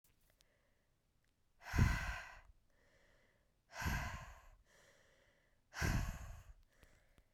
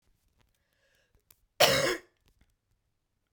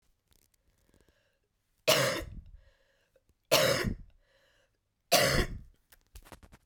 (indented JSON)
{
  "exhalation_length": "7.3 s",
  "exhalation_amplitude": 3078,
  "exhalation_signal_mean_std_ratio": 0.36,
  "cough_length": "3.3 s",
  "cough_amplitude": 17550,
  "cough_signal_mean_std_ratio": 0.25,
  "three_cough_length": "6.7 s",
  "three_cough_amplitude": 10968,
  "three_cough_signal_mean_std_ratio": 0.35,
  "survey_phase": "beta (2021-08-13 to 2022-03-07)",
  "age": "18-44",
  "gender": "Female",
  "wearing_mask": "No",
  "symptom_cough_any": true,
  "symptom_new_continuous_cough": true,
  "symptom_runny_or_blocked_nose": true,
  "symptom_sore_throat": true,
  "symptom_fatigue": true,
  "symptom_fever_high_temperature": true,
  "symptom_headache": true,
  "symptom_other": true,
  "symptom_onset": "3 days",
  "smoker_status": "Never smoked",
  "respiratory_condition_asthma": true,
  "respiratory_condition_other": false,
  "recruitment_source": "Test and Trace",
  "submission_delay": "1 day",
  "covid_test_result": "Positive",
  "covid_test_method": "RT-qPCR",
  "covid_ct_value": 17.8,
  "covid_ct_gene": "ORF1ab gene"
}